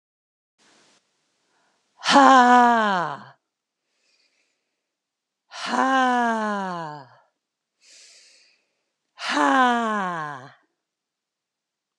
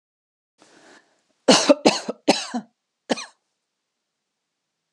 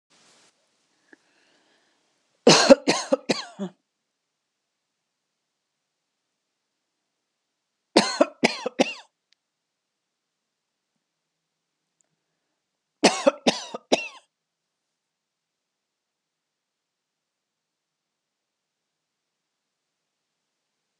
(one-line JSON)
{"exhalation_length": "12.0 s", "exhalation_amplitude": 29652, "exhalation_signal_mean_std_ratio": 0.37, "cough_length": "4.9 s", "cough_amplitude": 32741, "cough_signal_mean_std_ratio": 0.25, "three_cough_length": "21.0 s", "three_cough_amplitude": 32768, "three_cough_signal_mean_std_ratio": 0.18, "survey_phase": "beta (2021-08-13 to 2022-03-07)", "age": "45-64", "gender": "Female", "wearing_mask": "No", "symptom_none": true, "smoker_status": "Never smoked", "respiratory_condition_asthma": false, "respiratory_condition_other": false, "recruitment_source": "Test and Trace", "submission_delay": "2 days", "covid_test_result": "Negative", "covid_test_method": "RT-qPCR"}